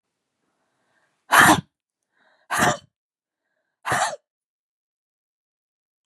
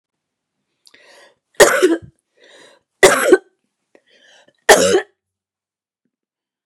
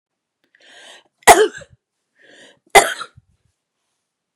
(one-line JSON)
{"exhalation_length": "6.1 s", "exhalation_amplitude": 30586, "exhalation_signal_mean_std_ratio": 0.26, "three_cough_length": "6.7 s", "three_cough_amplitude": 32768, "three_cough_signal_mean_std_ratio": 0.3, "cough_length": "4.4 s", "cough_amplitude": 32768, "cough_signal_mean_std_ratio": 0.22, "survey_phase": "beta (2021-08-13 to 2022-03-07)", "age": "45-64", "gender": "Female", "wearing_mask": "No", "symptom_other": true, "symptom_onset": "12 days", "smoker_status": "Never smoked", "respiratory_condition_asthma": false, "respiratory_condition_other": false, "recruitment_source": "REACT", "submission_delay": "2 days", "covid_test_result": "Negative", "covid_test_method": "RT-qPCR", "influenza_a_test_result": "Negative", "influenza_b_test_result": "Negative"}